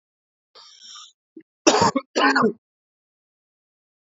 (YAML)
cough_length: 4.2 s
cough_amplitude: 30848
cough_signal_mean_std_ratio: 0.32
survey_phase: beta (2021-08-13 to 2022-03-07)
age: 45-64
gender: Male
wearing_mask: 'No'
symptom_cough_any: true
smoker_status: Ex-smoker
respiratory_condition_asthma: false
respiratory_condition_other: false
recruitment_source: REACT
submission_delay: 2 days
covid_test_result: Negative
covid_test_method: RT-qPCR
influenza_a_test_result: Negative
influenza_b_test_result: Negative